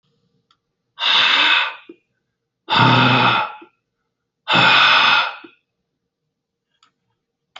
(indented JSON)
{
  "exhalation_length": "7.6 s",
  "exhalation_amplitude": 28966,
  "exhalation_signal_mean_std_ratio": 0.48,
  "survey_phase": "beta (2021-08-13 to 2022-03-07)",
  "age": "18-44",
  "gender": "Male",
  "wearing_mask": "No",
  "symptom_none": true,
  "smoker_status": "Never smoked",
  "respiratory_condition_asthma": false,
  "respiratory_condition_other": false,
  "recruitment_source": "REACT",
  "submission_delay": "1 day",
  "covid_test_result": "Negative",
  "covid_test_method": "RT-qPCR"
}